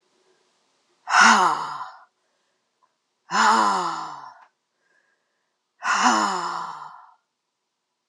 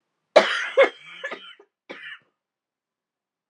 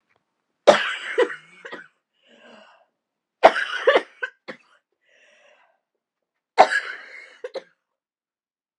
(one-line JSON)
{"exhalation_length": "8.1 s", "exhalation_amplitude": 26833, "exhalation_signal_mean_std_ratio": 0.4, "cough_length": "3.5 s", "cough_amplitude": 31499, "cough_signal_mean_std_ratio": 0.27, "three_cough_length": "8.8 s", "three_cough_amplitude": 32768, "three_cough_signal_mean_std_ratio": 0.25, "survey_phase": "beta (2021-08-13 to 2022-03-07)", "age": "45-64", "gender": "Female", "wearing_mask": "No", "symptom_cough_any": true, "symptom_runny_or_blocked_nose": true, "symptom_fatigue": true, "symptom_fever_high_temperature": true, "symptom_change_to_sense_of_smell_or_taste": true, "symptom_loss_of_taste": true, "smoker_status": "Never smoked", "respiratory_condition_asthma": false, "respiratory_condition_other": false, "recruitment_source": "Test and Trace", "submission_delay": "2 days", "covid_test_result": "Positive", "covid_test_method": "RT-qPCR"}